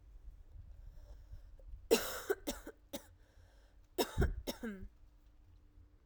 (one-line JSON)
{"three_cough_length": "6.1 s", "three_cough_amplitude": 5278, "three_cough_signal_mean_std_ratio": 0.4, "survey_phase": "alpha (2021-03-01 to 2021-08-12)", "age": "18-44", "gender": "Female", "wearing_mask": "No", "symptom_cough_any": true, "symptom_shortness_of_breath": true, "symptom_fatigue": true, "symptom_headache": true, "symptom_onset": "2 days", "smoker_status": "Never smoked", "respiratory_condition_asthma": false, "respiratory_condition_other": false, "recruitment_source": "Test and Trace", "submission_delay": "2 days", "covid_test_result": "Positive", "covid_test_method": "RT-qPCR"}